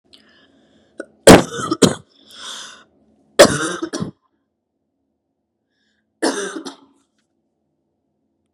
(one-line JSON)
{"three_cough_length": "8.5 s", "three_cough_amplitude": 32768, "three_cough_signal_mean_std_ratio": 0.24, "survey_phase": "beta (2021-08-13 to 2022-03-07)", "age": "18-44", "gender": "Female", "wearing_mask": "No", "symptom_none": true, "smoker_status": "Never smoked", "respiratory_condition_asthma": false, "respiratory_condition_other": false, "recruitment_source": "REACT", "submission_delay": "2 days", "covid_test_result": "Negative", "covid_test_method": "RT-qPCR", "influenza_a_test_result": "Negative", "influenza_b_test_result": "Negative"}